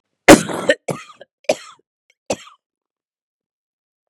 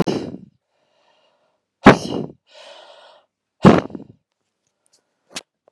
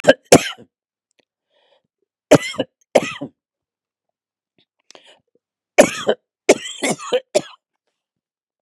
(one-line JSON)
{"cough_length": "4.1 s", "cough_amplitude": 32768, "cough_signal_mean_std_ratio": 0.22, "exhalation_length": "5.7 s", "exhalation_amplitude": 32768, "exhalation_signal_mean_std_ratio": 0.22, "three_cough_length": "8.6 s", "three_cough_amplitude": 32768, "three_cough_signal_mean_std_ratio": 0.24, "survey_phase": "beta (2021-08-13 to 2022-03-07)", "age": "45-64", "gender": "Female", "wearing_mask": "No", "symptom_cough_any": true, "symptom_runny_or_blocked_nose": true, "symptom_fatigue": true, "symptom_headache": true, "smoker_status": "Never smoked", "respiratory_condition_asthma": false, "respiratory_condition_other": false, "recruitment_source": "Test and Trace", "submission_delay": "2 days", "covid_test_result": "Positive", "covid_test_method": "RT-qPCR", "covid_ct_value": 29.5, "covid_ct_gene": "ORF1ab gene", "covid_ct_mean": 30.6, "covid_viral_load": "90 copies/ml", "covid_viral_load_category": "Minimal viral load (< 10K copies/ml)"}